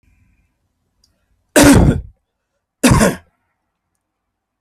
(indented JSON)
{
  "cough_length": "4.6 s",
  "cough_amplitude": 32768,
  "cough_signal_mean_std_ratio": 0.33,
  "survey_phase": "alpha (2021-03-01 to 2021-08-12)",
  "age": "45-64",
  "gender": "Male",
  "wearing_mask": "No",
  "symptom_none": true,
  "smoker_status": "Ex-smoker",
  "respiratory_condition_asthma": true,
  "respiratory_condition_other": false,
  "recruitment_source": "REACT",
  "submission_delay": "1 day",
  "covid_test_result": "Negative",
  "covid_test_method": "RT-qPCR"
}